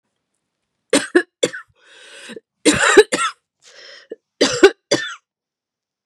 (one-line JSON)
{"three_cough_length": "6.1 s", "three_cough_amplitude": 32768, "three_cough_signal_mean_std_ratio": 0.32, "survey_phase": "beta (2021-08-13 to 2022-03-07)", "age": "45-64", "gender": "Female", "wearing_mask": "No", "symptom_none": true, "smoker_status": "Ex-smoker", "respiratory_condition_asthma": false, "respiratory_condition_other": false, "recruitment_source": "REACT", "submission_delay": "2 days", "covid_test_result": "Negative", "covid_test_method": "RT-qPCR"}